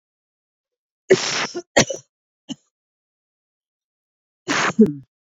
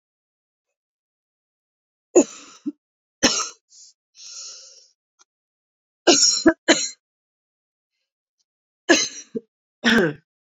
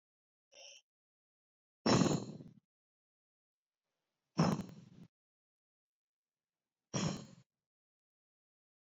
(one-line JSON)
{"cough_length": "5.3 s", "cough_amplitude": 26755, "cough_signal_mean_std_ratio": 0.29, "three_cough_length": "10.6 s", "three_cough_amplitude": 29344, "three_cough_signal_mean_std_ratio": 0.28, "exhalation_length": "8.9 s", "exhalation_amplitude": 4498, "exhalation_signal_mean_std_ratio": 0.25, "survey_phase": "beta (2021-08-13 to 2022-03-07)", "age": "18-44", "gender": "Female", "wearing_mask": "No", "symptom_cough_any": true, "symptom_runny_or_blocked_nose": true, "symptom_fatigue": true, "symptom_headache": true, "symptom_loss_of_taste": true, "symptom_onset": "4 days", "smoker_status": "Ex-smoker", "respiratory_condition_asthma": false, "respiratory_condition_other": false, "recruitment_source": "Test and Trace", "submission_delay": "1 day", "covid_test_result": "Positive", "covid_test_method": "RT-qPCR", "covid_ct_value": 25.4, "covid_ct_gene": "ORF1ab gene"}